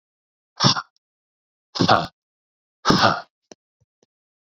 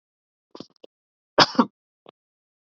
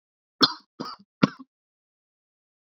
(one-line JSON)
{"exhalation_length": "4.5 s", "exhalation_amplitude": 28137, "exhalation_signal_mean_std_ratio": 0.31, "cough_length": "2.6 s", "cough_amplitude": 27399, "cough_signal_mean_std_ratio": 0.18, "three_cough_length": "2.6 s", "three_cough_amplitude": 27430, "three_cough_signal_mean_std_ratio": 0.18, "survey_phase": "beta (2021-08-13 to 2022-03-07)", "age": "18-44", "gender": "Male", "wearing_mask": "No", "symptom_cough_any": true, "symptom_runny_or_blocked_nose": true, "symptom_fatigue": true, "symptom_headache": true, "smoker_status": "Never smoked", "respiratory_condition_asthma": false, "respiratory_condition_other": false, "recruitment_source": "Test and Trace", "submission_delay": "1 day", "covid_test_result": "Positive", "covid_test_method": "RT-qPCR", "covid_ct_value": 25.3, "covid_ct_gene": "ORF1ab gene"}